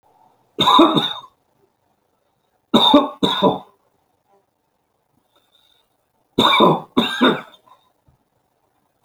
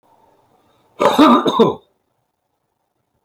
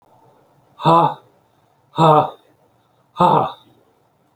{"three_cough_length": "9.0 s", "three_cough_amplitude": 29603, "three_cough_signal_mean_std_ratio": 0.37, "cough_length": "3.2 s", "cough_amplitude": 31464, "cough_signal_mean_std_ratio": 0.37, "exhalation_length": "4.4 s", "exhalation_amplitude": 28550, "exhalation_signal_mean_std_ratio": 0.37, "survey_phase": "beta (2021-08-13 to 2022-03-07)", "age": "65+", "gender": "Male", "wearing_mask": "No", "symptom_none": true, "smoker_status": "Ex-smoker", "respiratory_condition_asthma": false, "respiratory_condition_other": false, "recruitment_source": "REACT", "submission_delay": "13 days", "covid_test_result": "Negative", "covid_test_method": "RT-qPCR"}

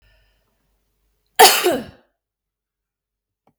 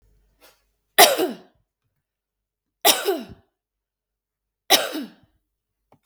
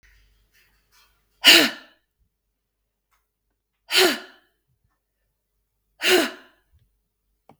{"cough_length": "3.6 s", "cough_amplitude": 32768, "cough_signal_mean_std_ratio": 0.24, "three_cough_length": "6.1 s", "three_cough_amplitude": 32768, "three_cough_signal_mean_std_ratio": 0.26, "exhalation_length": "7.6 s", "exhalation_amplitude": 32768, "exhalation_signal_mean_std_ratio": 0.24, "survey_phase": "beta (2021-08-13 to 2022-03-07)", "age": "45-64", "gender": "Female", "wearing_mask": "No", "symptom_none": true, "smoker_status": "Never smoked", "respiratory_condition_asthma": false, "respiratory_condition_other": false, "recruitment_source": "REACT", "submission_delay": "1 day", "covid_test_result": "Negative", "covid_test_method": "RT-qPCR", "influenza_a_test_result": "Negative", "influenza_b_test_result": "Negative"}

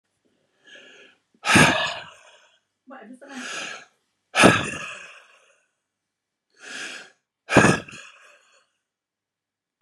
{"exhalation_length": "9.8 s", "exhalation_amplitude": 32531, "exhalation_signal_mean_std_ratio": 0.29, "survey_phase": "beta (2021-08-13 to 2022-03-07)", "age": "65+", "gender": "Male", "wearing_mask": "No", "symptom_cough_any": true, "symptom_runny_or_blocked_nose": true, "symptom_diarrhoea": true, "symptom_fatigue": true, "symptom_headache": true, "smoker_status": "Ex-smoker", "respiratory_condition_asthma": false, "respiratory_condition_other": false, "recruitment_source": "Test and Trace", "submission_delay": "1 day", "covid_test_result": "Positive", "covid_test_method": "RT-qPCR", "covid_ct_value": 23.2, "covid_ct_gene": "ORF1ab gene", "covid_ct_mean": 24.0, "covid_viral_load": "14000 copies/ml", "covid_viral_load_category": "Low viral load (10K-1M copies/ml)"}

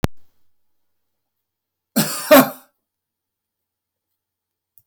{"cough_length": "4.9 s", "cough_amplitude": 32768, "cough_signal_mean_std_ratio": 0.22, "survey_phase": "beta (2021-08-13 to 2022-03-07)", "age": "65+", "gender": "Male", "wearing_mask": "No", "symptom_none": true, "smoker_status": "Ex-smoker", "respiratory_condition_asthma": true, "respiratory_condition_other": false, "recruitment_source": "REACT", "submission_delay": "2 days", "covid_test_result": "Negative", "covid_test_method": "RT-qPCR"}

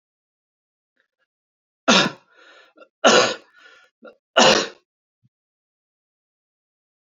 {"three_cough_length": "7.1 s", "three_cough_amplitude": 30534, "three_cough_signal_mean_std_ratio": 0.26, "survey_phase": "beta (2021-08-13 to 2022-03-07)", "age": "18-44", "gender": "Male", "wearing_mask": "No", "symptom_none": true, "smoker_status": "Ex-smoker", "respiratory_condition_asthma": false, "respiratory_condition_other": false, "recruitment_source": "REACT", "submission_delay": "1 day", "covid_test_result": "Negative", "covid_test_method": "RT-qPCR", "influenza_a_test_result": "Negative", "influenza_b_test_result": "Negative"}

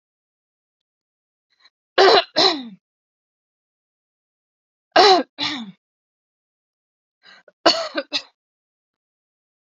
{"three_cough_length": "9.6 s", "three_cough_amplitude": 32767, "three_cough_signal_mean_std_ratio": 0.26, "survey_phase": "beta (2021-08-13 to 2022-03-07)", "age": "18-44", "gender": "Female", "wearing_mask": "No", "symptom_cough_any": true, "symptom_runny_or_blocked_nose": true, "symptom_sore_throat": true, "smoker_status": "Never smoked", "respiratory_condition_asthma": false, "respiratory_condition_other": false, "recruitment_source": "Test and Trace", "submission_delay": "2 days", "covid_test_result": "Positive", "covid_test_method": "RT-qPCR", "covid_ct_value": 18.0, "covid_ct_gene": "ORF1ab gene"}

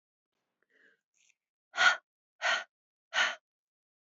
{"exhalation_length": "4.2 s", "exhalation_amplitude": 8236, "exhalation_signal_mean_std_ratio": 0.28, "survey_phase": "beta (2021-08-13 to 2022-03-07)", "age": "45-64", "gender": "Female", "wearing_mask": "No", "symptom_runny_or_blocked_nose": true, "smoker_status": "Never smoked", "respiratory_condition_asthma": false, "respiratory_condition_other": false, "recruitment_source": "REACT", "submission_delay": "1 day", "covid_test_result": "Negative", "covid_test_method": "RT-qPCR", "influenza_a_test_result": "Negative", "influenza_b_test_result": "Negative"}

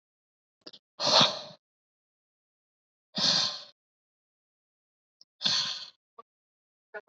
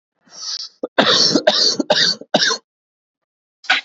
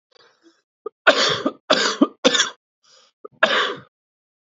{"exhalation_length": "7.1 s", "exhalation_amplitude": 15616, "exhalation_signal_mean_std_ratio": 0.3, "cough_length": "3.8 s", "cough_amplitude": 32768, "cough_signal_mean_std_ratio": 0.52, "three_cough_length": "4.4 s", "three_cough_amplitude": 28656, "three_cough_signal_mean_std_ratio": 0.4, "survey_phase": "beta (2021-08-13 to 2022-03-07)", "age": "18-44", "gender": "Male", "wearing_mask": "No", "symptom_cough_any": true, "symptom_runny_or_blocked_nose": true, "symptom_shortness_of_breath": true, "symptom_sore_throat": true, "symptom_fatigue": true, "symptom_headache": true, "symptom_onset": "3 days", "smoker_status": "Current smoker (e-cigarettes or vapes only)", "respiratory_condition_asthma": false, "respiratory_condition_other": false, "recruitment_source": "Test and Trace", "submission_delay": "2 days", "covid_test_result": "Positive", "covid_test_method": "RT-qPCR", "covid_ct_value": 24.8, "covid_ct_gene": "ORF1ab gene"}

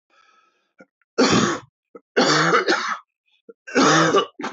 {"three_cough_length": "4.5 s", "three_cough_amplitude": 18602, "three_cough_signal_mean_std_ratio": 0.54, "survey_phase": "alpha (2021-03-01 to 2021-08-12)", "age": "45-64", "gender": "Male", "wearing_mask": "No", "symptom_new_continuous_cough": true, "symptom_fatigue": true, "symptom_fever_high_temperature": true, "symptom_headache": true, "symptom_change_to_sense_of_smell_or_taste": true, "symptom_onset": "3 days", "smoker_status": "Ex-smoker", "respiratory_condition_asthma": true, "respiratory_condition_other": false, "recruitment_source": "Test and Trace", "submission_delay": "2 days", "covid_test_result": "Positive", "covid_test_method": "RT-qPCR", "covid_ct_value": 16.4, "covid_ct_gene": "ORF1ab gene", "covid_ct_mean": 17.1, "covid_viral_load": "2500000 copies/ml", "covid_viral_load_category": "High viral load (>1M copies/ml)"}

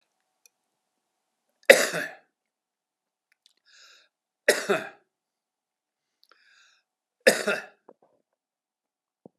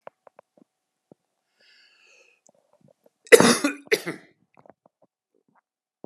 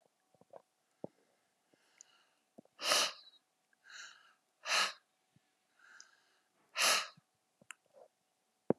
{"three_cough_length": "9.4 s", "three_cough_amplitude": 32767, "three_cough_signal_mean_std_ratio": 0.18, "cough_length": "6.1 s", "cough_amplitude": 32768, "cough_signal_mean_std_ratio": 0.18, "exhalation_length": "8.8 s", "exhalation_amplitude": 7380, "exhalation_signal_mean_std_ratio": 0.26, "survey_phase": "beta (2021-08-13 to 2022-03-07)", "age": "45-64", "gender": "Male", "wearing_mask": "No", "symptom_none": true, "smoker_status": "Current smoker (11 or more cigarettes per day)", "respiratory_condition_asthma": false, "respiratory_condition_other": false, "recruitment_source": "REACT", "submission_delay": "1 day", "covid_test_result": "Negative", "covid_test_method": "RT-qPCR"}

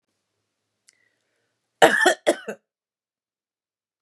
{"cough_length": "4.0 s", "cough_amplitude": 32317, "cough_signal_mean_std_ratio": 0.24, "survey_phase": "beta (2021-08-13 to 2022-03-07)", "age": "65+", "gender": "Female", "wearing_mask": "No", "symptom_none": true, "smoker_status": "Ex-smoker", "respiratory_condition_asthma": false, "respiratory_condition_other": false, "recruitment_source": "REACT", "submission_delay": "1 day", "covid_test_result": "Negative", "covid_test_method": "RT-qPCR", "influenza_a_test_result": "Negative", "influenza_b_test_result": "Negative"}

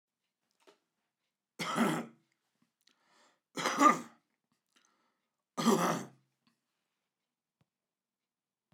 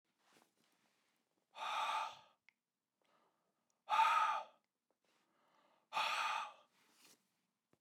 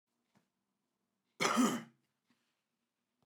{"three_cough_length": "8.7 s", "three_cough_amplitude": 9111, "three_cough_signal_mean_std_ratio": 0.27, "exhalation_length": "7.8 s", "exhalation_amplitude": 3043, "exhalation_signal_mean_std_ratio": 0.36, "cough_length": "3.3 s", "cough_amplitude": 5881, "cough_signal_mean_std_ratio": 0.28, "survey_phase": "beta (2021-08-13 to 2022-03-07)", "age": "45-64", "gender": "Male", "wearing_mask": "No", "symptom_none": true, "smoker_status": "Current smoker (1 to 10 cigarettes per day)", "respiratory_condition_asthma": false, "respiratory_condition_other": false, "recruitment_source": "REACT", "submission_delay": "1 day", "covid_test_result": "Negative", "covid_test_method": "RT-qPCR", "influenza_a_test_result": "Negative", "influenza_b_test_result": "Negative"}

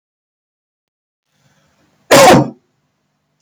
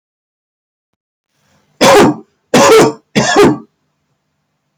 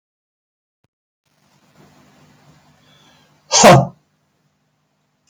{"cough_length": "3.4 s", "cough_amplitude": 32768, "cough_signal_mean_std_ratio": 0.29, "three_cough_length": "4.8 s", "three_cough_amplitude": 32768, "three_cough_signal_mean_std_ratio": 0.45, "exhalation_length": "5.3 s", "exhalation_amplitude": 32768, "exhalation_signal_mean_std_ratio": 0.21, "survey_phase": "beta (2021-08-13 to 2022-03-07)", "age": "65+", "gender": "Male", "wearing_mask": "No", "symptom_none": true, "smoker_status": "Never smoked", "respiratory_condition_asthma": false, "respiratory_condition_other": false, "recruitment_source": "Test and Trace", "submission_delay": "2 days", "covid_test_result": "Negative", "covid_test_method": "RT-qPCR"}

